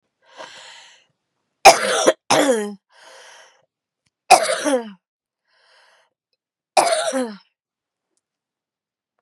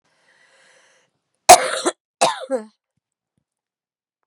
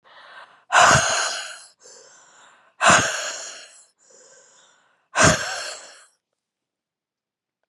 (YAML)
three_cough_length: 9.2 s
three_cough_amplitude: 32768
three_cough_signal_mean_std_ratio: 0.31
cough_length: 4.3 s
cough_amplitude: 32768
cough_signal_mean_std_ratio: 0.22
exhalation_length: 7.7 s
exhalation_amplitude: 29798
exhalation_signal_mean_std_ratio: 0.36
survey_phase: beta (2021-08-13 to 2022-03-07)
age: 45-64
gender: Female
wearing_mask: 'No'
symptom_cough_any: true
symptom_runny_or_blocked_nose: true
symptom_sore_throat: true
symptom_fatigue: true
symptom_fever_high_temperature: true
symptom_headache: true
symptom_onset: 3 days
smoker_status: Never smoked
respiratory_condition_asthma: false
respiratory_condition_other: false
recruitment_source: Test and Trace
submission_delay: 1 day
covid_test_result: Positive
covid_test_method: RT-qPCR
covid_ct_value: 28.9
covid_ct_gene: ORF1ab gene
covid_ct_mean: 29.1
covid_viral_load: 290 copies/ml
covid_viral_load_category: Minimal viral load (< 10K copies/ml)